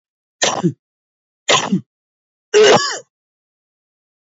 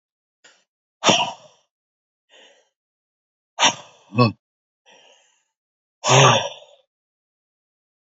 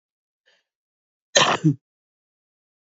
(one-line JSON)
{"three_cough_length": "4.3 s", "three_cough_amplitude": 30258, "three_cough_signal_mean_std_ratio": 0.36, "exhalation_length": "8.1 s", "exhalation_amplitude": 27795, "exhalation_signal_mean_std_ratio": 0.27, "cough_length": "2.8 s", "cough_amplitude": 32767, "cough_signal_mean_std_ratio": 0.26, "survey_phase": "beta (2021-08-13 to 2022-03-07)", "age": "45-64", "gender": "Male", "wearing_mask": "No", "symptom_runny_or_blocked_nose": true, "symptom_fatigue": true, "symptom_headache": true, "symptom_change_to_sense_of_smell_or_taste": true, "symptom_loss_of_taste": true, "symptom_onset": "2 days", "smoker_status": "Current smoker (1 to 10 cigarettes per day)", "respiratory_condition_asthma": false, "respiratory_condition_other": true, "recruitment_source": "Test and Trace", "submission_delay": "1 day", "covid_test_result": "Positive", "covid_test_method": "RT-qPCR", "covid_ct_value": 19.4, "covid_ct_gene": "ORF1ab gene", "covid_ct_mean": 19.8, "covid_viral_load": "310000 copies/ml", "covid_viral_load_category": "Low viral load (10K-1M copies/ml)"}